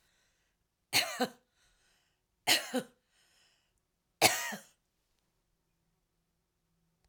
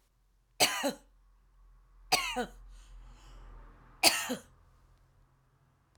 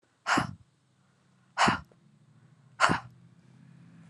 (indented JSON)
{
  "three_cough_length": "7.1 s",
  "three_cough_amplitude": 15636,
  "three_cough_signal_mean_std_ratio": 0.25,
  "cough_length": "6.0 s",
  "cough_amplitude": 13089,
  "cough_signal_mean_std_ratio": 0.33,
  "exhalation_length": "4.1 s",
  "exhalation_amplitude": 20218,
  "exhalation_signal_mean_std_ratio": 0.32,
  "survey_phase": "alpha (2021-03-01 to 2021-08-12)",
  "age": "45-64",
  "gender": "Female",
  "wearing_mask": "No",
  "symptom_none": true,
  "symptom_onset": "12 days",
  "smoker_status": "Ex-smoker",
  "respiratory_condition_asthma": true,
  "respiratory_condition_other": false,
  "recruitment_source": "REACT",
  "submission_delay": "31 days",
  "covid_test_result": "Negative",
  "covid_test_method": "RT-qPCR"
}